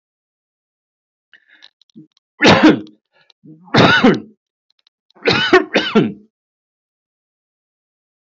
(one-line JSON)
{"three_cough_length": "8.4 s", "three_cough_amplitude": 32022, "three_cough_signal_mean_std_ratio": 0.34, "survey_phase": "beta (2021-08-13 to 2022-03-07)", "age": "45-64", "gender": "Male", "wearing_mask": "No", "symptom_none": true, "smoker_status": "Ex-smoker", "respiratory_condition_asthma": false, "respiratory_condition_other": false, "recruitment_source": "REACT", "submission_delay": "6 days", "covid_test_result": "Negative", "covid_test_method": "RT-qPCR"}